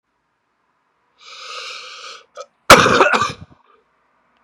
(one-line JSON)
{"cough_length": "4.4 s", "cough_amplitude": 32768, "cough_signal_mean_std_ratio": 0.3, "survey_phase": "beta (2021-08-13 to 2022-03-07)", "age": "18-44", "gender": "Male", "wearing_mask": "No", "symptom_cough_any": true, "symptom_new_continuous_cough": true, "symptom_runny_or_blocked_nose": true, "symptom_sore_throat": true, "symptom_abdominal_pain": true, "symptom_diarrhoea": true, "symptom_fatigue": true, "symptom_headache": true, "symptom_onset": "6 days", "smoker_status": "Ex-smoker", "respiratory_condition_asthma": false, "respiratory_condition_other": false, "recruitment_source": "Test and Trace", "submission_delay": "1 day", "covid_test_result": "Positive", "covid_test_method": "RT-qPCR", "covid_ct_value": 20.2, "covid_ct_gene": "ORF1ab gene", "covid_ct_mean": 20.8, "covid_viral_load": "160000 copies/ml", "covid_viral_load_category": "Low viral load (10K-1M copies/ml)"}